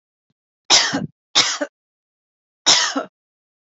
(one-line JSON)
{"three_cough_length": "3.7 s", "three_cough_amplitude": 32768, "three_cough_signal_mean_std_ratio": 0.37, "survey_phase": "beta (2021-08-13 to 2022-03-07)", "age": "18-44", "gender": "Female", "wearing_mask": "No", "symptom_none": true, "smoker_status": "Never smoked", "respiratory_condition_asthma": false, "respiratory_condition_other": false, "recruitment_source": "REACT", "submission_delay": "1 day", "covid_test_result": "Negative", "covid_test_method": "RT-qPCR"}